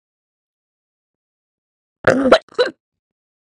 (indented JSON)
{
  "cough_length": "3.6 s",
  "cough_amplitude": 32768,
  "cough_signal_mean_std_ratio": 0.25,
  "survey_phase": "beta (2021-08-13 to 2022-03-07)",
  "age": "18-44",
  "gender": "Female",
  "wearing_mask": "No",
  "symptom_cough_any": true,
  "symptom_new_continuous_cough": true,
  "symptom_runny_or_blocked_nose": true,
  "symptom_shortness_of_breath": true,
  "symptom_sore_throat": true,
  "symptom_abdominal_pain": true,
  "symptom_diarrhoea": true,
  "symptom_fatigue": true,
  "symptom_fever_high_temperature": true,
  "symptom_headache": true,
  "symptom_onset": "4 days",
  "smoker_status": "Ex-smoker",
  "respiratory_condition_asthma": false,
  "respiratory_condition_other": false,
  "recruitment_source": "Test and Trace",
  "submission_delay": "1 day",
  "covid_test_result": "Positive",
  "covid_test_method": "RT-qPCR",
  "covid_ct_value": 23.4,
  "covid_ct_gene": "N gene"
}